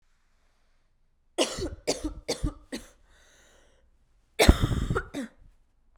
{"cough_length": "6.0 s", "cough_amplitude": 32767, "cough_signal_mean_std_ratio": 0.32, "survey_phase": "beta (2021-08-13 to 2022-03-07)", "age": "18-44", "gender": "Female", "wearing_mask": "No", "symptom_new_continuous_cough": true, "symptom_runny_or_blocked_nose": true, "symptom_fatigue": true, "symptom_headache": true, "symptom_other": true, "symptom_onset": "3 days", "smoker_status": "Never smoked", "respiratory_condition_asthma": false, "respiratory_condition_other": false, "recruitment_source": "Test and Trace", "submission_delay": "2 days", "covid_test_result": "Positive", "covid_test_method": "RT-qPCR", "covid_ct_value": 19.8, "covid_ct_gene": "N gene", "covid_ct_mean": 19.8, "covid_viral_load": "320000 copies/ml", "covid_viral_load_category": "Low viral load (10K-1M copies/ml)"}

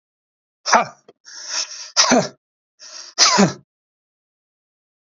{"exhalation_length": "5.0 s", "exhalation_amplitude": 32767, "exhalation_signal_mean_std_ratio": 0.36, "survey_phase": "beta (2021-08-13 to 2022-03-07)", "age": "45-64", "gender": "Male", "wearing_mask": "No", "symptom_none": true, "smoker_status": "Ex-smoker", "respiratory_condition_asthma": false, "respiratory_condition_other": false, "recruitment_source": "REACT", "submission_delay": "2 days", "covid_test_result": "Negative", "covid_test_method": "RT-qPCR", "influenza_a_test_result": "Negative", "influenza_b_test_result": "Negative"}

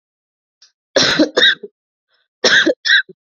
{"cough_length": "3.3 s", "cough_amplitude": 32120, "cough_signal_mean_std_ratio": 0.45, "survey_phase": "alpha (2021-03-01 to 2021-08-12)", "age": "18-44", "gender": "Female", "wearing_mask": "No", "symptom_none": true, "smoker_status": "Never smoked", "respiratory_condition_asthma": false, "respiratory_condition_other": false, "recruitment_source": "REACT", "submission_delay": "2 days", "covid_test_result": "Negative", "covid_test_method": "RT-qPCR"}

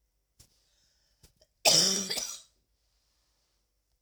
{"cough_length": "4.0 s", "cough_amplitude": 14137, "cough_signal_mean_std_ratio": 0.29, "survey_phase": "beta (2021-08-13 to 2022-03-07)", "age": "18-44", "gender": "Female", "wearing_mask": "No", "symptom_cough_any": true, "symptom_runny_or_blocked_nose": true, "symptom_shortness_of_breath": true, "symptom_sore_throat": true, "symptom_abdominal_pain": true, "symptom_fatigue": true, "symptom_headache": true, "symptom_change_to_sense_of_smell_or_taste": true, "symptom_loss_of_taste": true, "symptom_onset": "4 days", "smoker_status": "Never smoked", "respiratory_condition_asthma": false, "respiratory_condition_other": false, "recruitment_source": "Test and Trace", "submission_delay": "1 day", "covid_test_result": "Positive", "covid_test_method": "RT-qPCR"}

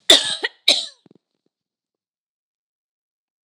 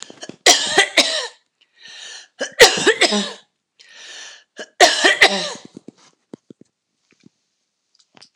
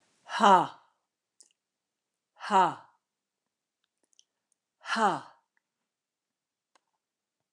{"cough_length": "3.4 s", "cough_amplitude": 29204, "cough_signal_mean_std_ratio": 0.24, "three_cough_length": "8.4 s", "three_cough_amplitude": 29204, "three_cough_signal_mean_std_ratio": 0.36, "exhalation_length": "7.5 s", "exhalation_amplitude": 15172, "exhalation_signal_mean_std_ratio": 0.25, "survey_phase": "beta (2021-08-13 to 2022-03-07)", "age": "65+", "gender": "Female", "wearing_mask": "No", "symptom_shortness_of_breath": true, "symptom_fatigue": true, "symptom_headache": true, "symptom_onset": "12 days", "smoker_status": "Never smoked", "respiratory_condition_asthma": false, "respiratory_condition_other": false, "recruitment_source": "REACT", "submission_delay": "1 day", "covid_test_result": "Negative", "covid_test_method": "RT-qPCR", "influenza_a_test_result": "Negative", "influenza_b_test_result": "Negative"}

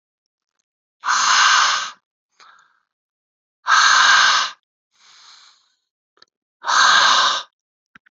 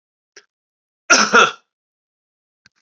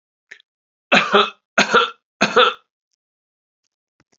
{"exhalation_length": "8.1 s", "exhalation_amplitude": 29382, "exhalation_signal_mean_std_ratio": 0.46, "cough_length": "2.8 s", "cough_amplitude": 32768, "cough_signal_mean_std_ratio": 0.28, "three_cough_length": "4.2 s", "three_cough_amplitude": 32556, "three_cough_signal_mean_std_ratio": 0.35, "survey_phase": "beta (2021-08-13 to 2022-03-07)", "age": "45-64", "gender": "Male", "wearing_mask": "No", "symptom_runny_or_blocked_nose": true, "symptom_fatigue": true, "symptom_headache": true, "symptom_onset": "4 days", "smoker_status": "Never smoked", "respiratory_condition_asthma": false, "respiratory_condition_other": false, "recruitment_source": "Test and Trace", "submission_delay": "1 day", "covid_test_result": "Positive", "covid_test_method": "RT-qPCR", "covid_ct_value": 18.0, "covid_ct_gene": "ORF1ab gene", "covid_ct_mean": 19.4, "covid_viral_load": "430000 copies/ml", "covid_viral_load_category": "Low viral load (10K-1M copies/ml)"}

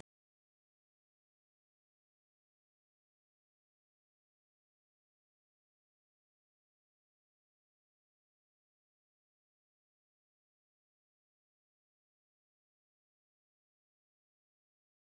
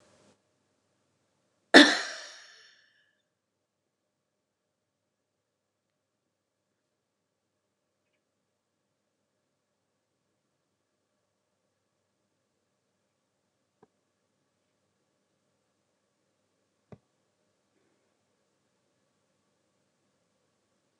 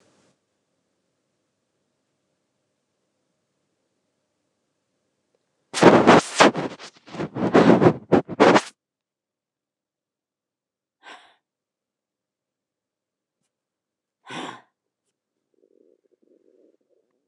{"three_cough_length": "15.1 s", "three_cough_amplitude": 430, "three_cough_signal_mean_std_ratio": 0.02, "cough_length": "21.0 s", "cough_amplitude": 29204, "cough_signal_mean_std_ratio": 0.08, "exhalation_length": "17.3 s", "exhalation_amplitude": 29204, "exhalation_signal_mean_std_ratio": 0.23, "survey_phase": "beta (2021-08-13 to 2022-03-07)", "age": "65+", "gender": "Female", "wearing_mask": "No", "symptom_none": true, "smoker_status": "Ex-smoker", "respiratory_condition_asthma": false, "respiratory_condition_other": false, "recruitment_source": "REACT", "submission_delay": "3 days", "covid_test_result": "Negative", "covid_test_method": "RT-qPCR", "influenza_a_test_result": "Negative", "influenza_b_test_result": "Negative"}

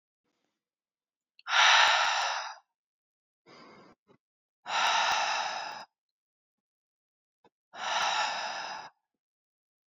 {"exhalation_length": "10.0 s", "exhalation_amplitude": 12055, "exhalation_signal_mean_std_ratio": 0.41, "survey_phase": "beta (2021-08-13 to 2022-03-07)", "age": "18-44", "gender": "Female", "wearing_mask": "No", "symptom_cough_any": true, "symptom_new_continuous_cough": true, "symptom_runny_or_blocked_nose": true, "symptom_sore_throat": true, "symptom_fever_high_temperature": true, "symptom_headache": true, "symptom_other": true, "smoker_status": "Never smoked", "respiratory_condition_asthma": false, "respiratory_condition_other": false, "recruitment_source": "Test and Trace", "submission_delay": "1 day", "covid_test_result": "Positive", "covid_test_method": "LFT"}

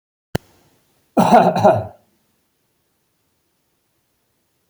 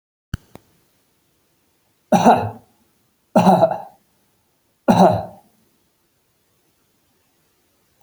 {"cough_length": "4.7 s", "cough_amplitude": 28395, "cough_signal_mean_std_ratio": 0.29, "three_cough_length": "8.0 s", "three_cough_amplitude": 32767, "three_cough_signal_mean_std_ratio": 0.29, "survey_phase": "beta (2021-08-13 to 2022-03-07)", "age": "45-64", "gender": "Male", "wearing_mask": "No", "symptom_none": true, "smoker_status": "Ex-smoker", "respiratory_condition_asthma": true, "respiratory_condition_other": false, "recruitment_source": "REACT", "submission_delay": "1 day", "covid_test_result": "Negative", "covid_test_method": "RT-qPCR"}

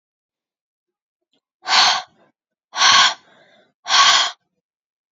{"exhalation_length": "5.1 s", "exhalation_amplitude": 30913, "exhalation_signal_mean_std_ratio": 0.38, "survey_phase": "beta (2021-08-13 to 2022-03-07)", "age": "18-44", "gender": "Female", "wearing_mask": "No", "symptom_runny_or_blocked_nose": true, "smoker_status": "Never smoked", "respiratory_condition_asthma": false, "respiratory_condition_other": false, "recruitment_source": "REACT", "submission_delay": "1 day", "covid_test_result": "Negative", "covid_test_method": "RT-qPCR", "influenza_a_test_result": "Negative", "influenza_b_test_result": "Negative"}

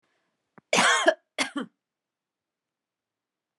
{"cough_length": "3.6 s", "cough_amplitude": 18503, "cough_signal_mean_std_ratio": 0.3, "survey_phase": "beta (2021-08-13 to 2022-03-07)", "age": "45-64", "gender": "Female", "wearing_mask": "No", "symptom_runny_or_blocked_nose": true, "smoker_status": "Never smoked", "respiratory_condition_asthma": false, "respiratory_condition_other": false, "recruitment_source": "REACT", "submission_delay": "2 days", "covid_test_result": "Negative", "covid_test_method": "RT-qPCR"}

